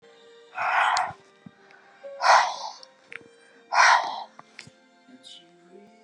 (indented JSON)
{
  "exhalation_length": "6.0 s",
  "exhalation_amplitude": 18200,
  "exhalation_signal_mean_std_ratio": 0.39,
  "survey_phase": "beta (2021-08-13 to 2022-03-07)",
  "age": "65+",
  "gender": "Female",
  "wearing_mask": "No",
  "symptom_none": true,
  "smoker_status": "Ex-smoker",
  "respiratory_condition_asthma": false,
  "respiratory_condition_other": false,
  "recruitment_source": "REACT",
  "submission_delay": "1 day",
  "covid_test_result": "Negative",
  "covid_test_method": "RT-qPCR",
  "influenza_a_test_result": "Negative",
  "influenza_b_test_result": "Negative"
}